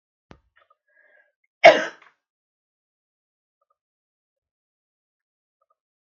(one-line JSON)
{"cough_length": "6.1 s", "cough_amplitude": 32767, "cough_signal_mean_std_ratio": 0.12, "survey_phase": "beta (2021-08-13 to 2022-03-07)", "age": "65+", "gender": "Female", "wearing_mask": "No", "symptom_none": true, "smoker_status": "Never smoked", "respiratory_condition_asthma": false, "respiratory_condition_other": false, "recruitment_source": "REACT", "submission_delay": "3 days", "covid_test_result": "Negative", "covid_test_method": "RT-qPCR", "influenza_a_test_result": "Negative", "influenza_b_test_result": "Negative"}